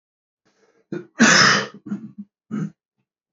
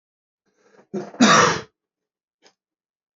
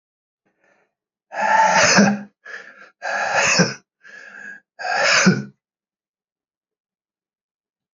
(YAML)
cough_length: 3.3 s
cough_amplitude: 26636
cough_signal_mean_std_ratio: 0.37
three_cough_length: 3.2 s
three_cough_amplitude: 27210
three_cough_signal_mean_std_ratio: 0.3
exhalation_length: 7.9 s
exhalation_amplitude: 25184
exhalation_signal_mean_std_ratio: 0.43
survey_phase: beta (2021-08-13 to 2022-03-07)
age: 45-64
gender: Male
wearing_mask: 'No'
symptom_cough_any: true
symptom_new_continuous_cough: true
symptom_runny_or_blocked_nose: true
symptom_fatigue: true
symptom_change_to_sense_of_smell_or_taste: true
smoker_status: Never smoked
respiratory_condition_asthma: false
respiratory_condition_other: false
recruitment_source: Test and Trace
submission_delay: 3 days
covid_test_result: Positive
covid_test_method: LFT